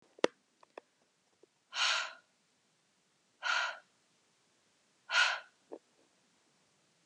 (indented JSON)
{
  "exhalation_length": "7.1 s",
  "exhalation_amplitude": 10616,
  "exhalation_signal_mean_std_ratio": 0.29,
  "survey_phase": "beta (2021-08-13 to 2022-03-07)",
  "age": "18-44",
  "gender": "Female",
  "wearing_mask": "No",
  "symptom_abdominal_pain": true,
  "smoker_status": "Never smoked",
  "respiratory_condition_asthma": false,
  "respiratory_condition_other": false,
  "recruitment_source": "REACT",
  "submission_delay": "2 days",
  "covid_test_result": "Negative",
  "covid_test_method": "RT-qPCR"
}